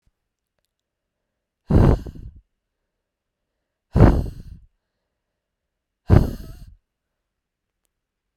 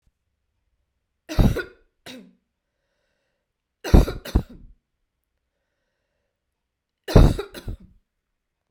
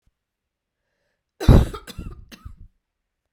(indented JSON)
{
  "exhalation_length": "8.4 s",
  "exhalation_amplitude": 32768,
  "exhalation_signal_mean_std_ratio": 0.25,
  "three_cough_length": "8.7 s",
  "three_cough_amplitude": 32768,
  "three_cough_signal_mean_std_ratio": 0.22,
  "cough_length": "3.3 s",
  "cough_amplitude": 32767,
  "cough_signal_mean_std_ratio": 0.22,
  "survey_phase": "beta (2021-08-13 to 2022-03-07)",
  "age": "45-64",
  "gender": "Female",
  "wearing_mask": "No",
  "symptom_cough_any": true,
  "symptom_runny_or_blocked_nose": true,
  "symptom_headache": true,
  "symptom_onset": "4 days",
  "smoker_status": "Never smoked",
  "respiratory_condition_asthma": false,
  "respiratory_condition_other": false,
  "recruitment_source": "Test and Trace",
  "submission_delay": "1 day",
  "covid_test_result": "Negative",
  "covid_test_method": "RT-qPCR"
}